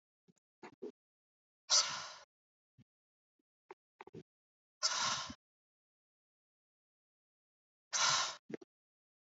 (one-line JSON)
{"exhalation_length": "9.3 s", "exhalation_amplitude": 5099, "exhalation_signal_mean_std_ratio": 0.28, "survey_phase": "alpha (2021-03-01 to 2021-08-12)", "age": "18-44", "gender": "Female", "wearing_mask": "No", "symptom_none": true, "smoker_status": "Never smoked", "respiratory_condition_asthma": true, "respiratory_condition_other": false, "recruitment_source": "REACT", "submission_delay": "2 days", "covid_test_result": "Negative", "covid_test_method": "RT-qPCR"}